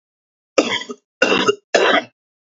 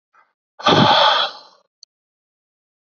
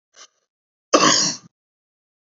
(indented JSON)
{
  "three_cough_length": "2.5 s",
  "three_cough_amplitude": 30149,
  "three_cough_signal_mean_std_ratio": 0.45,
  "exhalation_length": "3.0 s",
  "exhalation_amplitude": 28038,
  "exhalation_signal_mean_std_ratio": 0.39,
  "cough_length": "2.4 s",
  "cough_amplitude": 28163,
  "cough_signal_mean_std_ratio": 0.32,
  "survey_phase": "beta (2021-08-13 to 2022-03-07)",
  "age": "18-44",
  "gender": "Male",
  "wearing_mask": "No",
  "symptom_cough_any": true,
  "symptom_fatigue": true,
  "smoker_status": "Never smoked",
  "respiratory_condition_asthma": true,
  "respiratory_condition_other": false,
  "recruitment_source": "Test and Trace",
  "submission_delay": "2 days",
  "covid_test_result": "Positive",
  "covid_test_method": "LFT"
}